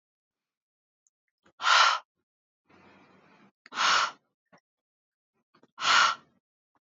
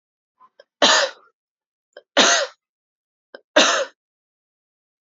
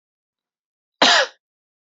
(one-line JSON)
{"exhalation_length": "6.8 s", "exhalation_amplitude": 11528, "exhalation_signal_mean_std_ratio": 0.31, "three_cough_length": "5.1 s", "three_cough_amplitude": 28325, "three_cough_signal_mean_std_ratio": 0.32, "cough_length": "2.0 s", "cough_amplitude": 28760, "cough_signal_mean_std_ratio": 0.28, "survey_phase": "beta (2021-08-13 to 2022-03-07)", "age": "18-44", "gender": "Female", "wearing_mask": "No", "symptom_none": true, "smoker_status": "Ex-smoker", "respiratory_condition_asthma": true, "respiratory_condition_other": false, "recruitment_source": "REACT", "submission_delay": "2 days", "covid_test_result": "Negative", "covid_test_method": "RT-qPCR", "influenza_a_test_result": "Negative", "influenza_b_test_result": "Negative"}